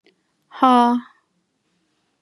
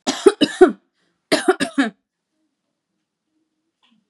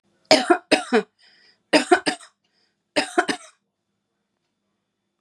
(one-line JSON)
{"exhalation_length": "2.2 s", "exhalation_amplitude": 29027, "exhalation_signal_mean_std_ratio": 0.33, "cough_length": "4.1 s", "cough_amplitude": 32768, "cough_signal_mean_std_ratio": 0.28, "three_cough_length": "5.2 s", "three_cough_amplitude": 30582, "three_cough_signal_mean_std_ratio": 0.3, "survey_phase": "beta (2021-08-13 to 2022-03-07)", "age": "45-64", "gender": "Female", "wearing_mask": "No", "symptom_cough_any": true, "symptom_runny_or_blocked_nose": true, "symptom_sore_throat": true, "symptom_headache": true, "symptom_onset": "7 days", "smoker_status": "Never smoked", "respiratory_condition_asthma": false, "respiratory_condition_other": false, "recruitment_source": "Test and Trace", "submission_delay": "1 day", "covid_test_result": "Positive", "covid_test_method": "RT-qPCR", "covid_ct_value": 23.6, "covid_ct_gene": "ORF1ab gene", "covid_ct_mean": 23.7, "covid_viral_load": "17000 copies/ml", "covid_viral_load_category": "Low viral load (10K-1M copies/ml)"}